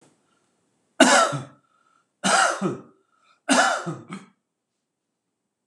{"three_cough_length": "5.7 s", "three_cough_amplitude": 26028, "three_cough_signal_mean_std_ratio": 0.37, "survey_phase": "beta (2021-08-13 to 2022-03-07)", "age": "65+", "gender": "Male", "wearing_mask": "No", "symptom_none": true, "smoker_status": "Never smoked", "respiratory_condition_asthma": false, "respiratory_condition_other": false, "recruitment_source": "REACT", "submission_delay": "2 days", "covid_test_result": "Negative", "covid_test_method": "RT-qPCR", "influenza_a_test_result": "Negative", "influenza_b_test_result": "Negative"}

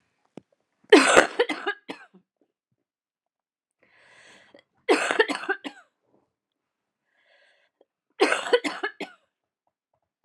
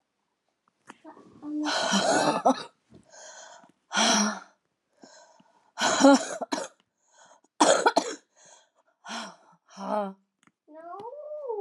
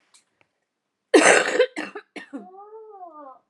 {"three_cough_length": "10.2 s", "three_cough_amplitude": 32767, "three_cough_signal_mean_std_ratio": 0.27, "exhalation_length": "11.6 s", "exhalation_amplitude": 18518, "exhalation_signal_mean_std_ratio": 0.41, "cough_length": "3.5 s", "cough_amplitude": 30810, "cough_signal_mean_std_ratio": 0.34, "survey_phase": "beta (2021-08-13 to 2022-03-07)", "age": "18-44", "gender": "Female", "wearing_mask": "No", "symptom_cough_any": true, "symptom_sore_throat": true, "symptom_fatigue": true, "symptom_fever_high_temperature": true, "symptom_change_to_sense_of_smell_or_taste": true, "symptom_loss_of_taste": true, "symptom_onset": "6 days", "smoker_status": "Never smoked", "respiratory_condition_asthma": false, "respiratory_condition_other": false, "recruitment_source": "Test and Trace", "submission_delay": "2 days", "covid_test_result": "Positive", "covid_test_method": "RT-qPCR", "covid_ct_value": 19.3, "covid_ct_gene": "ORF1ab gene", "covid_ct_mean": 20.3, "covid_viral_load": "210000 copies/ml", "covid_viral_load_category": "Low viral load (10K-1M copies/ml)"}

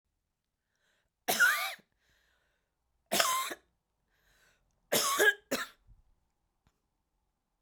{"three_cough_length": "7.6 s", "three_cough_amplitude": 13810, "three_cough_signal_mean_std_ratio": 0.33, "survey_phase": "beta (2021-08-13 to 2022-03-07)", "age": "45-64", "gender": "Female", "wearing_mask": "No", "symptom_sore_throat": true, "symptom_fatigue": true, "symptom_other": true, "smoker_status": "Current smoker (e-cigarettes or vapes only)", "respiratory_condition_asthma": false, "respiratory_condition_other": false, "recruitment_source": "Test and Trace", "submission_delay": "2 days", "covid_test_result": "Positive", "covid_test_method": "RT-qPCR", "covid_ct_value": 16.8, "covid_ct_gene": "ORF1ab gene", "covid_ct_mean": 17.2, "covid_viral_load": "2300000 copies/ml", "covid_viral_load_category": "High viral load (>1M copies/ml)"}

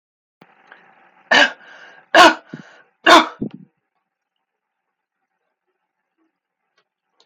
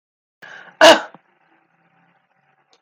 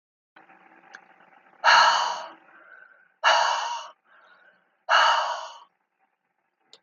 {"three_cough_length": "7.3 s", "three_cough_amplitude": 32684, "three_cough_signal_mean_std_ratio": 0.24, "cough_length": "2.8 s", "cough_amplitude": 31670, "cough_signal_mean_std_ratio": 0.22, "exhalation_length": "6.8 s", "exhalation_amplitude": 21271, "exhalation_signal_mean_std_ratio": 0.39, "survey_phase": "beta (2021-08-13 to 2022-03-07)", "age": "45-64", "gender": "Female", "wearing_mask": "No", "symptom_none": true, "smoker_status": "Never smoked", "respiratory_condition_asthma": true, "respiratory_condition_other": false, "recruitment_source": "REACT", "submission_delay": "2 days", "covid_test_result": "Negative", "covid_test_method": "RT-qPCR"}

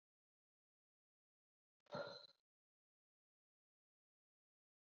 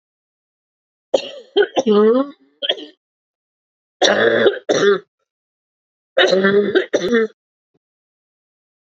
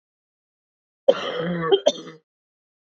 {"exhalation_length": "4.9 s", "exhalation_amplitude": 451, "exhalation_signal_mean_std_ratio": 0.19, "three_cough_length": "8.9 s", "three_cough_amplitude": 31863, "three_cough_signal_mean_std_ratio": 0.46, "cough_length": "3.0 s", "cough_amplitude": 26492, "cough_signal_mean_std_ratio": 0.33, "survey_phase": "beta (2021-08-13 to 2022-03-07)", "age": "18-44", "gender": "Female", "wearing_mask": "No", "symptom_cough_any": true, "symptom_new_continuous_cough": true, "symptom_runny_or_blocked_nose": true, "symptom_shortness_of_breath": true, "symptom_sore_throat": true, "symptom_abdominal_pain": true, "symptom_fatigue": true, "symptom_fever_high_temperature": true, "symptom_headache": true, "symptom_change_to_sense_of_smell_or_taste": true, "symptom_loss_of_taste": true, "symptom_other": true, "symptom_onset": "10 days", "smoker_status": "Current smoker (e-cigarettes or vapes only)", "respiratory_condition_asthma": true, "respiratory_condition_other": false, "recruitment_source": "Test and Trace", "submission_delay": "2 days", "covid_test_result": "Positive", "covid_test_method": "ePCR"}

